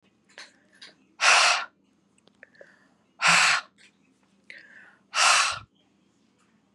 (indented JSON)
{
  "exhalation_length": "6.7 s",
  "exhalation_amplitude": 16364,
  "exhalation_signal_mean_std_ratio": 0.36,
  "survey_phase": "beta (2021-08-13 to 2022-03-07)",
  "age": "18-44",
  "gender": "Female",
  "wearing_mask": "No",
  "symptom_cough_any": true,
  "symptom_runny_or_blocked_nose": true,
  "symptom_sore_throat": true,
  "symptom_fatigue": true,
  "symptom_fever_high_temperature": true,
  "symptom_other": true,
  "symptom_onset": "2 days",
  "smoker_status": "Current smoker (11 or more cigarettes per day)",
  "respiratory_condition_asthma": false,
  "respiratory_condition_other": false,
  "recruitment_source": "Test and Trace",
  "submission_delay": "1 day",
  "covid_test_result": "Positive",
  "covid_test_method": "RT-qPCR",
  "covid_ct_value": 18.8,
  "covid_ct_gene": "ORF1ab gene",
  "covid_ct_mean": 19.2,
  "covid_viral_load": "490000 copies/ml",
  "covid_viral_load_category": "Low viral load (10K-1M copies/ml)"
}